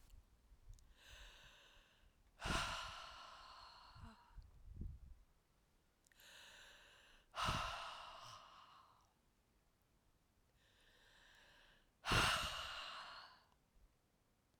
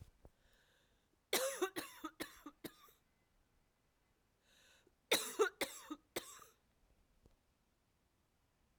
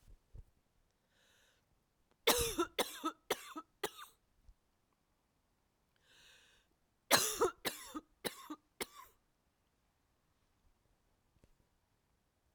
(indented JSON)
{
  "exhalation_length": "14.6 s",
  "exhalation_amplitude": 2310,
  "exhalation_signal_mean_std_ratio": 0.4,
  "cough_length": "8.8 s",
  "cough_amplitude": 3256,
  "cough_signal_mean_std_ratio": 0.28,
  "three_cough_length": "12.5 s",
  "three_cough_amplitude": 9583,
  "three_cough_signal_mean_std_ratio": 0.26,
  "survey_phase": "alpha (2021-03-01 to 2021-08-12)",
  "age": "45-64",
  "gender": "Female",
  "wearing_mask": "No",
  "symptom_cough_any": true,
  "symptom_shortness_of_breath": true,
  "symptom_diarrhoea": true,
  "symptom_fatigue": true,
  "symptom_headache": true,
  "smoker_status": "Never smoked",
  "respiratory_condition_asthma": false,
  "respiratory_condition_other": false,
  "recruitment_source": "Test and Trace",
  "submission_delay": "2 days",
  "covid_test_result": "Positive",
  "covid_test_method": "RT-qPCR"
}